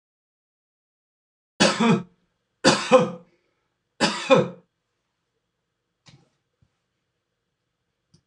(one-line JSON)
{"three_cough_length": "8.3 s", "three_cough_amplitude": 24961, "three_cough_signal_mean_std_ratio": 0.28, "survey_phase": "beta (2021-08-13 to 2022-03-07)", "age": "45-64", "gender": "Male", "wearing_mask": "No", "symptom_sore_throat": true, "smoker_status": "Never smoked", "respiratory_condition_asthma": false, "respiratory_condition_other": false, "recruitment_source": "REACT", "submission_delay": "3 days", "covid_test_result": "Negative", "covid_test_method": "RT-qPCR"}